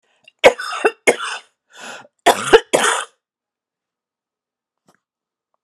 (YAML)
cough_length: 5.6 s
cough_amplitude: 32768
cough_signal_mean_std_ratio: 0.29
survey_phase: beta (2021-08-13 to 2022-03-07)
age: 65+
gender: Female
wearing_mask: 'No'
symptom_cough_any: true
symptom_sore_throat: true
symptom_change_to_sense_of_smell_or_taste: true
symptom_onset: 7 days
smoker_status: Never smoked
respiratory_condition_asthma: false
respiratory_condition_other: false
recruitment_source: Test and Trace
submission_delay: 2 days
covid_test_result: Positive
covid_test_method: RT-qPCR
covid_ct_value: 17.8
covid_ct_gene: N gene
covid_ct_mean: 17.9
covid_viral_load: 1300000 copies/ml
covid_viral_load_category: High viral load (>1M copies/ml)